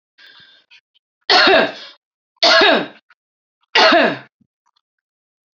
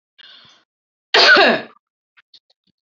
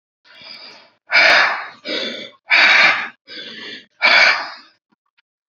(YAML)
three_cough_length: 5.5 s
three_cough_amplitude: 31660
three_cough_signal_mean_std_ratio: 0.4
cough_length: 2.8 s
cough_amplitude: 32768
cough_signal_mean_std_ratio: 0.34
exhalation_length: 5.5 s
exhalation_amplitude: 30187
exhalation_signal_mean_std_ratio: 0.48
survey_phase: beta (2021-08-13 to 2022-03-07)
age: 45-64
gender: Female
wearing_mask: 'No'
symptom_sore_throat: true
symptom_fatigue: true
smoker_status: Current smoker (1 to 10 cigarettes per day)
respiratory_condition_asthma: false
respiratory_condition_other: false
recruitment_source: REACT
submission_delay: 1 day
covid_test_result: Negative
covid_test_method: RT-qPCR
influenza_a_test_result: Negative
influenza_b_test_result: Negative